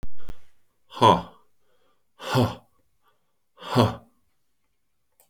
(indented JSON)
{
  "exhalation_length": "5.3 s",
  "exhalation_amplitude": 24836,
  "exhalation_signal_mean_std_ratio": 0.38,
  "survey_phase": "alpha (2021-03-01 to 2021-08-12)",
  "age": "45-64",
  "gender": "Male",
  "wearing_mask": "No",
  "symptom_none": true,
  "smoker_status": "Current smoker (11 or more cigarettes per day)",
  "respiratory_condition_asthma": false,
  "respiratory_condition_other": false,
  "recruitment_source": "REACT",
  "submission_delay": "3 days",
  "covid_test_result": "Negative",
  "covid_test_method": "RT-qPCR"
}